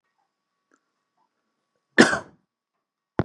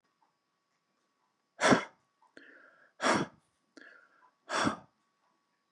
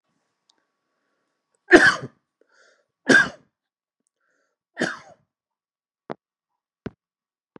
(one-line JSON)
{"cough_length": "3.2 s", "cough_amplitude": 32733, "cough_signal_mean_std_ratio": 0.18, "exhalation_length": "5.7 s", "exhalation_amplitude": 10724, "exhalation_signal_mean_std_ratio": 0.27, "three_cough_length": "7.6 s", "three_cough_amplitude": 32768, "three_cough_signal_mean_std_ratio": 0.2, "survey_phase": "beta (2021-08-13 to 2022-03-07)", "age": "45-64", "gender": "Male", "wearing_mask": "No", "symptom_none": true, "smoker_status": "Never smoked", "respiratory_condition_asthma": false, "respiratory_condition_other": false, "recruitment_source": "REACT", "submission_delay": "10 days", "covid_test_result": "Negative", "covid_test_method": "RT-qPCR", "influenza_a_test_result": "Negative", "influenza_b_test_result": "Negative"}